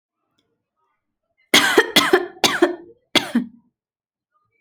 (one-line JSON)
{"cough_length": "4.6 s", "cough_amplitude": 32768, "cough_signal_mean_std_ratio": 0.35, "survey_phase": "alpha (2021-03-01 to 2021-08-12)", "age": "18-44", "gender": "Female", "wearing_mask": "No", "symptom_none": true, "smoker_status": "Never smoked", "respiratory_condition_asthma": true, "respiratory_condition_other": false, "recruitment_source": "REACT", "submission_delay": "2 days", "covid_test_result": "Negative", "covid_test_method": "RT-qPCR"}